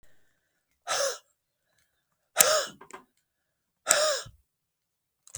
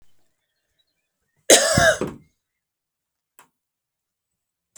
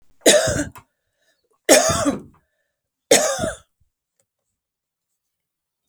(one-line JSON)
{"exhalation_length": "5.4 s", "exhalation_amplitude": 32768, "exhalation_signal_mean_std_ratio": 0.3, "cough_length": "4.8 s", "cough_amplitude": 32768, "cough_signal_mean_std_ratio": 0.25, "three_cough_length": "5.9 s", "three_cough_amplitude": 32768, "three_cough_signal_mean_std_ratio": 0.34, "survey_phase": "beta (2021-08-13 to 2022-03-07)", "age": "65+", "gender": "Female", "wearing_mask": "No", "symptom_cough_any": true, "symptom_onset": "12 days", "smoker_status": "Never smoked", "respiratory_condition_asthma": false, "respiratory_condition_other": true, "recruitment_source": "REACT", "submission_delay": "3 days", "covid_test_result": "Negative", "covid_test_method": "RT-qPCR", "influenza_a_test_result": "Negative", "influenza_b_test_result": "Negative"}